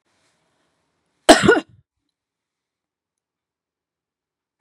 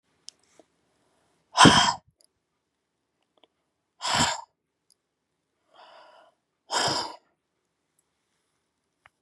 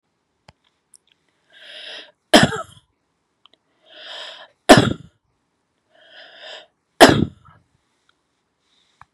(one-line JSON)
{"cough_length": "4.6 s", "cough_amplitude": 32768, "cough_signal_mean_std_ratio": 0.18, "exhalation_length": "9.2 s", "exhalation_amplitude": 28547, "exhalation_signal_mean_std_ratio": 0.23, "three_cough_length": "9.1 s", "three_cough_amplitude": 32768, "three_cough_signal_mean_std_ratio": 0.21, "survey_phase": "beta (2021-08-13 to 2022-03-07)", "age": "45-64", "gender": "Female", "wearing_mask": "No", "symptom_none": true, "smoker_status": "Ex-smoker", "respiratory_condition_asthma": false, "respiratory_condition_other": false, "recruitment_source": "REACT", "submission_delay": "2 days", "covid_test_result": "Negative", "covid_test_method": "RT-qPCR", "influenza_a_test_result": "Positive", "influenza_a_ct_value": 36.1, "influenza_b_test_result": "Negative"}